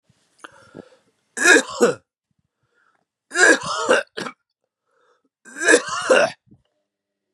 {"three_cough_length": "7.3 s", "three_cough_amplitude": 30634, "three_cough_signal_mean_std_ratio": 0.36, "survey_phase": "beta (2021-08-13 to 2022-03-07)", "age": "45-64", "gender": "Male", "wearing_mask": "No", "symptom_none": true, "smoker_status": "Ex-smoker", "respiratory_condition_asthma": false, "respiratory_condition_other": false, "recruitment_source": "REACT", "submission_delay": "9 days", "covid_test_result": "Negative", "covid_test_method": "RT-qPCR", "influenza_a_test_result": "Negative", "influenza_b_test_result": "Negative"}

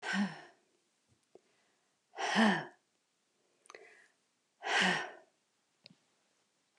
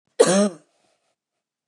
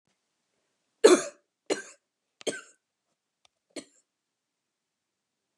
{"exhalation_length": "6.8 s", "exhalation_amplitude": 6069, "exhalation_signal_mean_std_ratio": 0.33, "cough_length": "1.7 s", "cough_amplitude": 28030, "cough_signal_mean_std_ratio": 0.32, "three_cough_length": "5.6 s", "three_cough_amplitude": 21140, "three_cough_signal_mean_std_ratio": 0.16, "survey_phase": "beta (2021-08-13 to 2022-03-07)", "age": "45-64", "gender": "Female", "wearing_mask": "No", "symptom_cough_any": true, "symptom_runny_or_blocked_nose": true, "symptom_onset": "12 days", "smoker_status": "Never smoked", "respiratory_condition_asthma": true, "respiratory_condition_other": false, "recruitment_source": "REACT", "submission_delay": "27 days", "covid_test_result": "Negative", "covid_test_method": "RT-qPCR"}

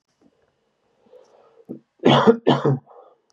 {"cough_length": "3.3 s", "cough_amplitude": 31032, "cough_signal_mean_std_ratio": 0.33, "survey_phase": "beta (2021-08-13 to 2022-03-07)", "age": "18-44", "gender": "Male", "wearing_mask": "No", "symptom_cough_any": true, "symptom_runny_or_blocked_nose": true, "symptom_headache": true, "smoker_status": "Never smoked", "respiratory_condition_asthma": false, "respiratory_condition_other": false, "recruitment_source": "Test and Trace", "submission_delay": "1 day", "covid_test_result": "Positive", "covid_test_method": "LFT"}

